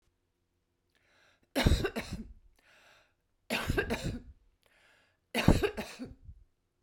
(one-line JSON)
{"three_cough_length": "6.8 s", "three_cough_amplitude": 14780, "three_cough_signal_mean_std_ratio": 0.34, "survey_phase": "beta (2021-08-13 to 2022-03-07)", "age": "45-64", "gender": "Female", "wearing_mask": "No", "symptom_none": true, "smoker_status": "Ex-smoker", "respiratory_condition_asthma": false, "respiratory_condition_other": false, "recruitment_source": "REACT", "submission_delay": "8 days", "covid_test_result": "Negative", "covid_test_method": "RT-qPCR"}